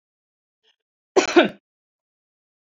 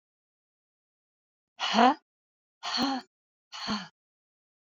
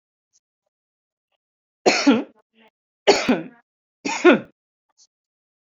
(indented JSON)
{
  "cough_length": "2.6 s",
  "cough_amplitude": 28075,
  "cough_signal_mean_std_ratio": 0.23,
  "exhalation_length": "4.7 s",
  "exhalation_amplitude": 15833,
  "exhalation_signal_mean_std_ratio": 0.3,
  "three_cough_length": "5.6 s",
  "three_cough_amplitude": 27758,
  "three_cough_signal_mean_std_ratio": 0.29,
  "survey_phase": "beta (2021-08-13 to 2022-03-07)",
  "age": "65+",
  "gender": "Female",
  "wearing_mask": "No",
  "symptom_none": true,
  "smoker_status": "Never smoked",
  "respiratory_condition_asthma": false,
  "respiratory_condition_other": false,
  "recruitment_source": "REACT",
  "submission_delay": "3 days",
  "covid_test_result": "Negative",
  "covid_test_method": "RT-qPCR",
  "influenza_a_test_result": "Negative",
  "influenza_b_test_result": "Negative"
}